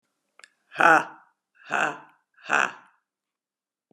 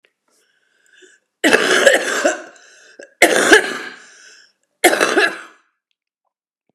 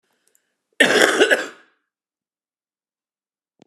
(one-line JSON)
{"exhalation_length": "3.9 s", "exhalation_amplitude": 23491, "exhalation_signal_mean_std_ratio": 0.28, "three_cough_length": "6.7 s", "three_cough_amplitude": 32768, "three_cough_signal_mean_std_ratio": 0.41, "cough_length": "3.7 s", "cough_amplitude": 32768, "cough_signal_mean_std_ratio": 0.31, "survey_phase": "beta (2021-08-13 to 2022-03-07)", "age": "45-64", "gender": "Female", "wearing_mask": "No", "symptom_cough_any": true, "symptom_runny_or_blocked_nose": true, "symptom_sore_throat": true, "symptom_fatigue": true, "symptom_headache": true, "symptom_change_to_sense_of_smell_or_taste": true, "smoker_status": "Current smoker (11 or more cigarettes per day)", "respiratory_condition_asthma": false, "respiratory_condition_other": false, "recruitment_source": "Test and Trace", "submission_delay": "1 day", "covid_test_result": "Positive", "covid_test_method": "ePCR"}